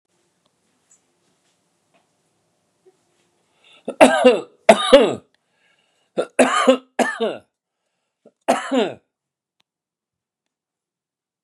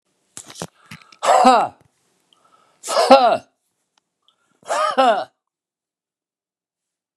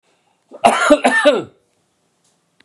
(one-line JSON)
{"three_cough_length": "11.4 s", "three_cough_amplitude": 32768, "three_cough_signal_mean_std_ratio": 0.28, "exhalation_length": "7.2 s", "exhalation_amplitude": 32768, "exhalation_signal_mean_std_ratio": 0.35, "cough_length": "2.6 s", "cough_amplitude": 32768, "cough_signal_mean_std_ratio": 0.42, "survey_phase": "beta (2021-08-13 to 2022-03-07)", "age": "65+", "gender": "Male", "wearing_mask": "No", "symptom_none": true, "smoker_status": "Ex-smoker", "respiratory_condition_asthma": true, "respiratory_condition_other": false, "recruitment_source": "REACT", "submission_delay": "1 day", "covid_test_result": "Negative", "covid_test_method": "RT-qPCR"}